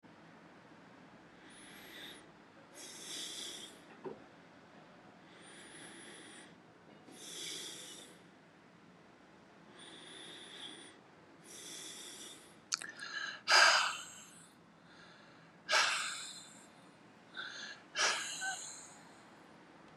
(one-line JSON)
{"exhalation_length": "20.0 s", "exhalation_amplitude": 8737, "exhalation_signal_mean_std_ratio": 0.38, "survey_phase": "beta (2021-08-13 to 2022-03-07)", "age": "65+", "gender": "Male", "wearing_mask": "No", "symptom_cough_any": true, "symptom_onset": "5 days", "smoker_status": "Never smoked", "respiratory_condition_asthma": false, "respiratory_condition_other": false, "recruitment_source": "Test and Trace", "submission_delay": "2 days", "covid_test_result": "Positive", "covid_test_method": "ePCR"}